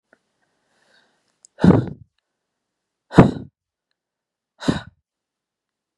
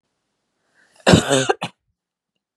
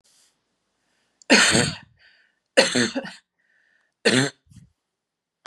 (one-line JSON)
{"exhalation_length": "6.0 s", "exhalation_amplitude": 32768, "exhalation_signal_mean_std_ratio": 0.2, "cough_length": "2.6 s", "cough_amplitude": 32768, "cough_signal_mean_std_ratio": 0.29, "three_cough_length": "5.5 s", "three_cough_amplitude": 30938, "three_cough_signal_mean_std_ratio": 0.34, "survey_phase": "beta (2021-08-13 to 2022-03-07)", "age": "45-64", "gender": "Female", "wearing_mask": "No", "symptom_cough_any": true, "symptom_shortness_of_breath": true, "symptom_fatigue": true, "symptom_onset": "8 days", "smoker_status": "Never smoked", "respiratory_condition_asthma": false, "respiratory_condition_other": false, "recruitment_source": "Test and Trace", "submission_delay": "2 days", "covid_test_result": "Positive", "covid_test_method": "RT-qPCR", "covid_ct_value": 20.6, "covid_ct_gene": "N gene"}